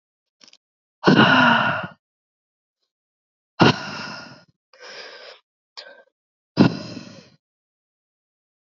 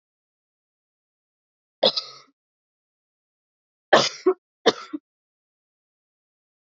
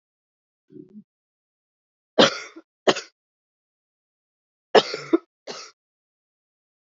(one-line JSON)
{"exhalation_length": "8.8 s", "exhalation_amplitude": 27723, "exhalation_signal_mean_std_ratio": 0.3, "three_cough_length": "6.7 s", "three_cough_amplitude": 27136, "three_cough_signal_mean_std_ratio": 0.2, "cough_length": "7.0 s", "cough_amplitude": 28213, "cough_signal_mean_std_ratio": 0.19, "survey_phase": "alpha (2021-03-01 to 2021-08-12)", "age": "18-44", "gender": "Female", "wearing_mask": "No", "symptom_cough_any": true, "symptom_new_continuous_cough": true, "symptom_fatigue": true, "symptom_headache": true, "symptom_change_to_sense_of_smell_or_taste": true, "symptom_loss_of_taste": true, "smoker_status": "Ex-smoker", "respiratory_condition_asthma": false, "respiratory_condition_other": false, "recruitment_source": "Test and Trace", "submission_delay": "1 day", "covid_test_result": "Positive", "covid_test_method": "RT-qPCR"}